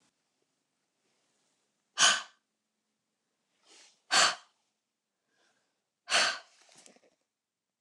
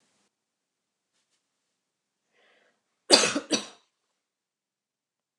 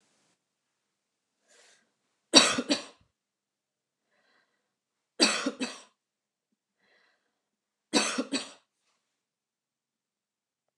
{
  "exhalation_length": "7.8 s",
  "exhalation_amplitude": 11891,
  "exhalation_signal_mean_std_ratio": 0.23,
  "cough_length": "5.4 s",
  "cough_amplitude": 28574,
  "cough_signal_mean_std_ratio": 0.18,
  "three_cough_length": "10.8 s",
  "three_cough_amplitude": 27120,
  "three_cough_signal_mean_std_ratio": 0.22,
  "survey_phase": "beta (2021-08-13 to 2022-03-07)",
  "age": "45-64",
  "gender": "Female",
  "wearing_mask": "No",
  "symptom_none": true,
  "smoker_status": "Never smoked",
  "respiratory_condition_asthma": false,
  "respiratory_condition_other": false,
  "recruitment_source": "REACT",
  "submission_delay": "1 day",
  "covid_test_result": "Negative",
  "covid_test_method": "RT-qPCR"
}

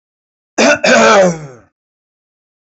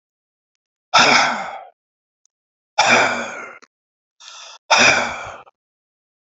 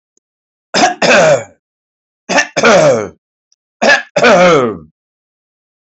{
  "cough_length": "2.6 s",
  "cough_amplitude": 31341,
  "cough_signal_mean_std_ratio": 0.49,
  "exhalation_length": "6.4 s",
  "exhalation_amplitude": 32555,
  "exhalation_signal_mean_std_ratio": 0.39,
  "three_cough_length": "6.0 s",
  "three_cough_amplitude": 31445,
  "three_cough_signal_mean_std_ratio": 0.52,
  "survey_phase": "alpha (2021-03-01 to 2021-08-12)",
  "age": "65+",
  "gender": "Male",
  "wearing_mask": "No",
  "symptom_none": true,
  "smoker_status": "Never smoked",
  "respiratory_condition_asthma": false,
  "respiratory_condition_other": false,
  "recruitment_source": "REACT",
  "submission_delay": "2 days",
  "covid_test_result": "Negative",
  "covid_test_method": "RT-qPCR"
}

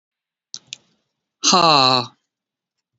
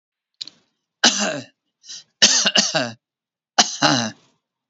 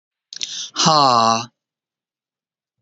{
  "exhalation_length": "3.0 s",
  "exhalation_amplitude": 31184,
  "exhalation_signal_mean_std_ratio": 0.33,
  "three_cough_length": "4.7 s",
  "three_cough_amplitude": 32768,
  "three_cough_signal_mean_std_ratio": 0.4,
  "cough_length": "2.8 s",
  "cough_amplitude": 28890,
  "cough_signal_mean_std_ratio": 0.4,
  "survey_phase": "beta (2021-08-13 to 2022-03-07)",
  "age": "65+",
  "gender": "Female",
  "wearing_mask": "No",
  "symptom_cough_any": true,
  "smoker_status": "Ex-smoker",
  "respiratory_condition_asthma": false,
  "respiratory_condition_other": false,
  "recruitment_source": "REACT",
  "submission_delay": "3 days",
  "covid_test_result": "Negative",
  "covid_test_method": "RT-qPCR"
}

